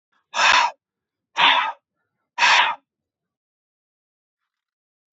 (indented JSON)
{
  "exhalation_length": "5.1 s",
  "exhalation_amplitude": 26260,
  "exhalation_signal_mean_std_ratio": 0.36,
  "survey_phase": "beta (2021-08-13 to 2022-03-07)",
  "age": "18-44",
  "gender": "Male",
  "wearing_mask": "No",
  "symptom_cough_any": true,
  "symptom_fatigue": true,
  "symptom_fever_high_temperature": true,
  "symptom_headache": true,
  "symptom_onset": "2 days",
  "smoker_status": "Never smoked",
  "respiratory_condition_asthma": false,
  "respiratory_condition_other": false,
  "recruitment_source": "Test and Trace",
  "submission_delay": "2 days",
  "covid_test_result": "Positive",
  "covid_test_method": "RT-qPCR"
}